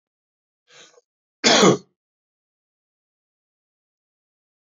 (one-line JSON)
{"cough_length": "4.8 s", "cough_amplitude": 27683, "cough_signal_mean_std_ratio": 0.21, "survey_phase": "beta (2021-08-13 to 2022-03-07)", "age": "65+", "gender": "Male", "wearing_mask": "No", "symptom_cough_any": true, "symptom_runny_or_blocked_nose": true, "symptom_shortness_of_breath": true, "symptom_sore_throat": true, "symptom_headache": true, "symptom_onset": "4 days", "smoker_status": "Ex-smoker", "respiratory_condition_asthma": true, "respiratory_condition_other": false, "recruitment_source": "Test and Trace", "submission_delay": "2 days", "covid_test_result": "Negative", "covid_test_method": "RT-qPCR"}